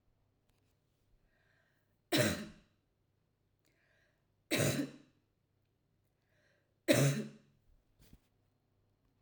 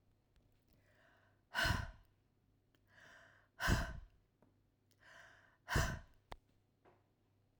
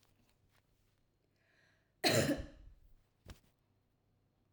{
  "three_cough_length": "9.2 s",
  "three_cough_amplitude": 7002,
  "three_cough_signal_mean_std_ratio": 0.27,
  "exhalation_length": "7.6 s",
  "exhalation_amplitude": 3434,
  "exhalation_signal_mean_std_ratio": 0.31,
  "cough_length": "4.5 s",
  "cough_amplitude": 4046,
  "cough_signal_mean_std_ratio": 0.26,
  "survey_phase": "alpha (2021-03-01 to 2021-08-12)",
  "age": "45-64",
  "gender": "Female",
  "wearing_mask": "No",
  "symptom_none": true,
  "smoker_status": "Never smoked",
  "respiratory_condition_asthma": false,
  "respiratory_condition_other": false,
  "recruitment_source": "REACT",
  "submission_delay": "5 days",
  "covid_test_result": "Negative",
  "covid_test_method": "RT-qPCR"
}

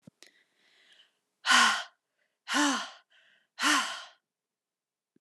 {
  "exhalation_length": "5.2 s",
  "exhalation_amplitude": 12218,
  "exhalation_signal_mean_std_ratio": 0.35,
  "survey_phase": "alpha (2021-03-01 to 2021-08-12)",
  "age": "18-44",
  "gender": "Female",
  "wearing_mask": "No",
  "symptom_none": true,
  "smoker_status": "Never smoked",
  "respiratory_condition_asthma": false,
  "respiratory_condition_other": false,
  "recruitment_source": "REACT",
  "submission_delay": "1 day",
  "covid_test_result": "Negative",
  "covid_test_method": "RT-qPCR"
}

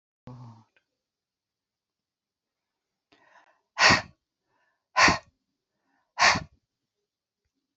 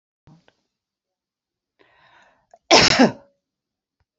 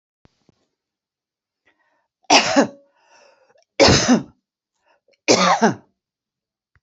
{
  "exhalation_length": "7.8 s",
  "exhalation_amplitude": 17306,
  "exhalation_signal_mean_std_ratio": 0.22,
  "cough_length": "4.2 s",
  "cough_amplitude": 32564,
  "cough_signal_mean_std_ratio": 0.24,
  "three_cough_length": "6.8 s",
  "three_cough_amplitude": 32321,
  "three_cough_signal_mean_std_ratio": 0.33,
  "survey_phase": "beta (2021-08-13 to 2022-03-07)",
  "age": "65+",
  "gender": "Female",
  "wearing_mask": "No",
  "symptom_none": true,
  "smoker_status": "Never smoked",
  "respiratory_condition_asthma": false,
  "respiratory_condition_other": false,
  "recruitment_source": "REACT",
  "submission_delay": "2 days",
  "covid_test_result": "Negative",
  "covid_test_method": "RT-qPCR",
  "influenza_a_test_result": "Negative",
  "influenza_b_test_result": "Negative"
}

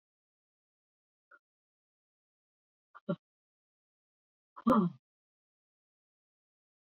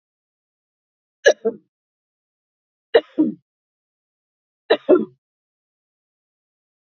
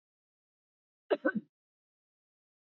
{
  "exhalation_length": "6.8 s",
  "exhalation_amplitude": 5794,
  "exhalation_signal_mean_std_ratio": 0.17,
  "three_cough_length": "7.0 s",
  "three_cough_amplitude": 28272,
  "three_cough_signal_mean_std_ratio": 0.21,
  "cough_length": "2.6 s",
  "cough_amplitude": 4327,
  "cough_signal_mean_std_ratio": 0.19,
  "survey_phase": "beta (2021-08-13 to 2022-03-07)",
  "age": "65+",
  "gender": "Female",
  "wearing_mask": "No",
  "symptom_none": true,
  "smoker_status": "Ex-smoker",
  "respiratory_condition_asthma": false,
  "respiratory_condition_other": false,
  "recruitment_source": "Test and Trace",
  "submission_delay": "0 days",
  "covid_test_result": "Negative",
  "covid_test_method": "LFT"
}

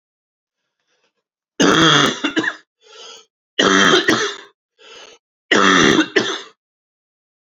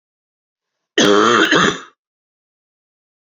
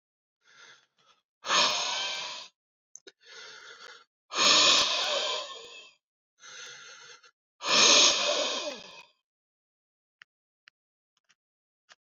{
  "three_cough_length": "7.6 s",
  "three_cough_amplitude": 30715,
  "three_cough_signal_mean_std_ratio": 0.45,
  "cough_length": "3.3 s",
  "cough_amplitude": 30404,
  "cough_signal_mean_std_ratio": 0.4,
  "exhalation_length": "12.1 s",
  "exhalation_amplitude": 15793,
  "exhalation_signal_mean_std_ratio": 0.4,
  "survey_phase": "beta (2021-08-13 to 2022-03-07)",
  "age": "18-44",
  "gender": "Male",
  "wearing_mask": "No",
  "symptom_cough_any": true,
  "symptom_new_continuous_cough": true,
  "symptom_runny_or_blocked_nose": true,
  "symptom_fatigue": true,
  "symptom_fever_high_temperature": true,
  "symptom_headache": true,
  "symptom_change_to_sense_of_smell_or_taste": true,
  "symptom_loss_of_taste": true,
  "symptom_other": true,
  "smoker_status": "Never smoked",
  "respiratory_condition_asthma": false,
  "respiratory_condition_other": false,
  "recruitment_source": "Test and Trace",
  "submission_delay": "1 day",
  "covid_test_result": "Positive",
  "covid_test_method": "RT-qPCR",
  "covid_ct_value": 18.9,
  "covid_ct_gene": "ORF1ab gene"
}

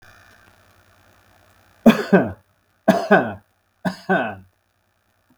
{
  "three_cough_length": "5.4 s",
  "three_cough_amplitude": 32768,
  "three_cough_signal_mean_std_ratio": 0.31,
  "survey_phase": "beta (2021-08-13 to 2022-03-07)",
  "age": "45-64",
  "gender": "Male",
  "wearing_mask": "No",
  "symptom_none": true,
  "smoker_status": "Never smoked",
  "respiratory_condition_asthma": false,
  "respiratory_condition_other": false,
  "recruitment_source": "REACT",
  "submission_delay": "2 days",
  "covid_test_result": "Negative",
  "covid_test_method": "RT-qPCR"
}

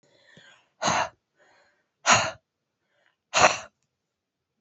{
  "exhalation_length": "4.6 s",
  "exhalation_amplitude": 26590,
  "exhalation_signal_mean_std_ratio": 0.29,
  "survey_phase": "alpha (2021-03-01 to 2021-08-12)",
  "age": "45-64",
  "gender": "Female",
  "wearing_mask": "No",
  "symptom_change_to_sense_of_smell_or_taste": true,
  "symptom_loss_of_taste": true,
  "symptom_onset": "2 days",
  "smoker_status": "Ex-smoker",
  "respiratory_condition_asthma": false,
  "respiratory_condition_other": false,
  "recruitment_source": "Test and Trace",
  "submission_delay": "1 day",
  "covid_test_result": "Positive",
  "covid_test_method": "RT-qPCR",
  "covid_ct_value": 21.1,
  "covid_ct_gene": "ORF1ab gene",
  "covid_ct_mean": 21.5,
  "covid_viral_load": "89000 copies/ml",
  "covid_viral_load_category": "Low viral load (10K-1M copies/ml)"
}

